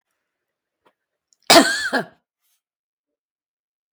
{"cough_length": "3.9 s", "cough_amplitude": 32768, "cough_signal_mean_std_ratio": 0.23, "survey_phase": "beta (2021-08-13 to 2022-03-07)", "age": "65+", "gender": "Female", "wearing_mask": "No", "symptom_none": true, "smoker_status": "Never smoked", "respiratory_condition_asthma": false, "respiratory_condition_other": false, "recruitment_source": "REACT", "submission_delay": "2 days", "covid_test_result": "Negative", "covid_test_method": "RT-qPCR", "influenza_a_test_result": "Unknown/Void", "influenza_b_test_result": "Unknown/Void"}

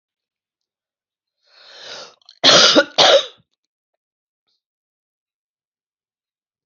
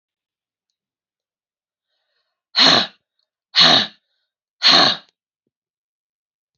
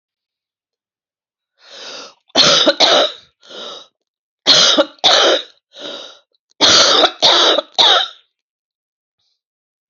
{"cough_length": "6.7 s", "cough_amplitude": 31454, "cough_signal_mean_std_ratio": 0.26, "exhalation_length": "6.6 s", "exhalation_amplitude": 31894, "exhalation_signal_mean_std_ratio": 0.3, "three_cough_length": "9.9 s", "three_cough_amplitude": 32768, "three_cough_signal_mean_std_ratio": 0.45, "survey_phase": "alpha (2021-03-01 to 2021-08-12)", "age": "45-64", "gender": "Female", "wearing_mask": "No", "symptom_cough_any": true, "symptom_shortness_of_breath": true, "symptom_fatigue": true, "symptom_change_to_sense_of_smell_or_taste": true, "symptom_onset": "6 days", "smoker_status": "Ex-smoker", "respiratory_condition_asthma": true, "respiratory_condition_other": false, "recruitment_source": "Test and Trace", "submission_delay": "2 days", "covid_test_result": "Positive", "covid_test_method": "RT-qPCR", "covid_ct_value": 17.6, "covid_ct_gene": "ORF1ab gene", "covid_ct_mean": 18.0, "covid_viral_load": "1300000 copies/ml", "covid_viral_load_category": "High viral load (>1M copies/ml)"}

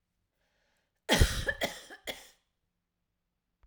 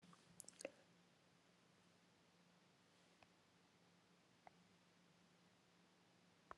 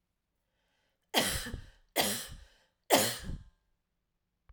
{"cough_length": "3.7 s", "cough_amplitude": 12142, "cough_signal_mean_std_ratio": 0.28, "exhalation_length": "6.6 s", "exhalation_amplitude": 765, "exhalation_signal_mean_std_ratio": 0.49, "three_cough_length": "4.5 s", "three_cough_amplitude": 10690, "three_cough_signal_mean_std_ratio": 0.36, "survey_phase": "alpha (2021-03-01 to 2021-08-12)", "age": "45-64", "gender": "Female", "wearing_mask": "No", "symptom_none": true, "smoker_status": "Prefer not to say", "respiratory_condition_asthma": false, "respiratory_condition_other": false, "recruitment_source": "REACT", "submission_delay": "2 days", "covid_test_result": "Negative", "covid_test_method": "RT-qPCR"}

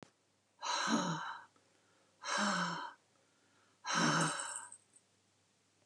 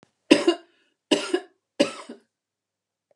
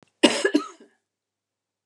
{"exhalation_length": "5.9 s", "exhalation_amplitude": 3236, "exhalation_signal_mean_std_ratio": 0.51, "three_cough_length": "3.2 s", "three_cough_amplitude": 32426, "three_cough_signal_mean_std_ratio": 0.28, "cough_length": "1.9 s", "cough_amplitude": 27654, "cough_signal_mean_std_ratio": 0.29, "survey_phase": "beta (2021-08-13 to 2022-03-07)", "age": "65+", "gender": "Female", "wearing_mask": "No", "symptom_cough_any": true, "symptom_shortness_of_breath": true, "smoker_status": "Ex-smoker", "respiratory_condition_asthma": true, "respiratory_condition_other": false, "recruitment_source": "Test and Trace", "submission_delay": "0 days", "covid_test_result": "Negative", "covid_test_method": "LFT"}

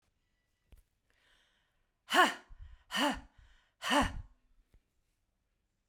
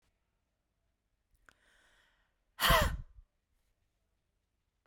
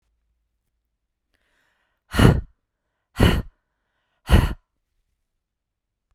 {"three_cough_length": "5.9 s", "three_cough_amplitude": 8549, "three_cough_signal_mean_std_ratio": 0.29, "cough_length": "4.9 s", "cough_amplitude": 7863, "cough_signal_mean_std_ratio": 0.22, "exhalation_length": "6.1 s", "exhalation_amplitude": 32767, "exhalation_signal_mean_std_ratio": 0.25, "survey_phase": "beta (2021-08-13 to 2022-03-07)", "age": "45-64", "gender": "Female", "wearing_mask": "No", "symptom_none": true, "smoker_status": "Never smoked", "respiratory_condition_asthma": false, "respiratory_condition_other": false, "recruitment_source": "REACT", "submission_delay": "10 days", "covid_test_result": "Negative", "covid_test_method": "RT-qPCR"}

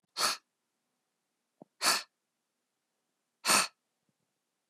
{"exhalation_length": "4.7 s", "exhalation_amplitude": 9931, "exhalation_signal_mean_std_ratio": 0.27, "survey_phase": "beta (2021-08-13 to 2022-03-07)", "age": "45-64", "gender": "Female", "wearing_mask": "No", "symptom_none": true, "smoker_status": "Never smoked", "respiratory_condition_asthma": false, "respiratory_condition_other": false, "recruitment_source": "REACT", "submission_delay": "1 day", "covid_test_result": "Negative", "covid_test_method": "RT-qPCR", "influenza_a_test_result": "Negative", "influenza_b_test_result": "Negative"}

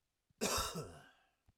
{"cough_length": "1.6 s", "cough_amplitude": 2331, "cough_signal_mean_std_ratio": 0.46, "survey_phase": "alpha (2021-03-01 to 2021-08-12)", "age": "18-44", "gender": "Male", "wearing_mask": "No", "symptom_none": true, "smoker_status": "Ex-smoker", "respiratory_condition_asthma": false, "respiratory_condition_other": false, "recruitment_source": "REACT", "submission_delay": "1 day", "covid_test_result": "Negative", "covid_test_method": "RT-qPCR"}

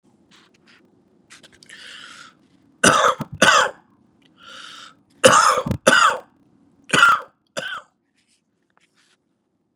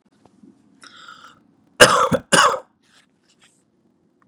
{"three_cough_length": "9.8 s", "three_cough_amplitude": 32768, "three_cough_signal_mean_std_ratio": 0.34, "cough_length": "4.3 s", "cough_amplitude": 32768, "cough_signal_mean_std_ratio": 0.28, "survey_phase": "beta (2021-08-13 to 2022-03-07)", "age": "45-64", "gender": "Male", "wearing_mask": "No", "symptom_cough_any": true, "symptom_runny_or_blocked_nose": true, "symptom_sore_throat": true, "symptom_fatigue": true, "symptom_change_to_sense_of_smell_or_taste": true, "symptom_loss_of_taste": true, "symptom_onset": "3 days", "smoker_status": "Never smoked", "respiratory_condition_asthma": false, "respiratory_condition_other": false, "recruitment_source": "Test and Trace", "submission_delay": "2 days", "covid_test_result": "Positive", "covid_test_method": "RT-qPCR", "covid_ct_value": 19.1, "covid_ct_gene": "ORF1ab gene", "covid_ct_mean": 19.7, "covid_viral_load": "340000 copies/ml", "covid_viral_load_category": "Low viral load (10K-1M copies/ml)"}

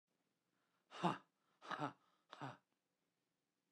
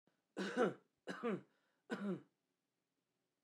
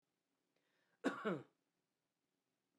{"exhalation_length": "3.7 s", "exhalation_amplitude": 1823, "exhalation_signal_mean_std_ratio": 0.27, "three_cough_length": "3.4 s", "three_cough_amplitude": 1928, "three_cough_signal_mean_std_ratio": 0.4, "cough_length": "2.8 s", "cough_amplitude": 1615, "cough_signal_mean_std_ratio": 0.26, "survey_phase": "beta (2021-08-13 to 2022-03-07)", "age": "45-64", "gender": "Male", "wearing_mask": "No", "symptom_none": true, "smoker_status": "Never smoked", "respiratory_condition_asthma": false, "respiratory_condition_other": false, "recruitment_source": "REACT", "submission_delay": "1 day", "covid_test_result": "Negative", "covid_test_method": "RT-qPCR", "influenza_a_test_result": "Negative", "influenza_b_test_result": "Negative"}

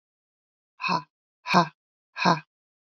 {"exhalation_length": "2.8 s", "exhalation_amplitude": 20278, "exhalation_signal_mean_std_ratio": 0.32, "survey_phase": "beta (2021-08-13 to 2022-03-07)", "age": "45-64", "gender": "Female", "wearing_mask": "No", "symptom_cough_any": true, "symptom_runny_or_blocked_nose": true, "symptom_sore_throat": true, "symptom_fatigue": true, "symptom_fever_high_temperature": true, "symptom_headache": true, "symptom_change_to_sense_of_smell_or_taste": true, "symptom_onset": "4 days", "smoker_status": "Never smoked", "respiratory_condition_asthma": false, "respiratory_condition_other": false, "recruitment_source": "Test and Trace", "submission_delay": "2 days", "covid_test_result": "Positive", "covid_test_method": "RT-qPCR", "covid_ct_value": 17.4, "covid_ct_gene": "ORF1ab gene", "covid_ct_mean": 17.7, "covid_viral_load": "1500000 copies/ml", "covid_viral_load_category": "High viral load (>1M copies/ml)"}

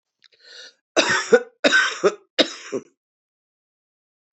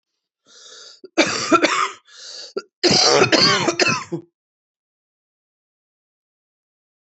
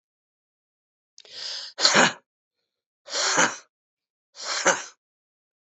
{"three_cough_length": "4.4 s", "three_cough_amplitude": 27391, "three_cough_signal_mean_std_ratio": 0.35, "cough_length": "7.2 s", "cough_amplitude": 28063, "cough_signal_mean_std_ratio": 0.41, "exhalation_length": "5.7 s", "exhalation_amplitude": 26560, "exhalation_signal_mean_std_ratio": 0.34, "survey_phase": "beta (2021-08-13 to 2022-03-07)", "age": "45-64", "gender": "Female", "wearing_mask": "No", "symptom_cough_any": true, "symptom_new_continuous_cough": true, "symptom_runny_or_blocked_nose": true, "symptom_sore_throat": true, "symptom_diarrhoea": true, "symptom_fatigue": true, "symptom_headache": true, "symptom_change_to_sense_of_smell_or_taste": true, "symptom_onset": "4 days", "smoker_status": "Ex-smoker", "respiratory_condition_asthma": false, "respiratory_condition_other": false, "recruitment_source": "Test and Trace", "submission_delay": "2 days", "covid_test_result": "Positive", "covid_test_method": "RT-qPCR", "covid_ct_value": 19.6, "covid_ct_gene": "ORF1ab gene", "covid_ct_mean": 19.7, "covid_viral_load": "340000 copies/ml", "covid_viral_load_category": "Low viral load (10K-1M copies/ml)"}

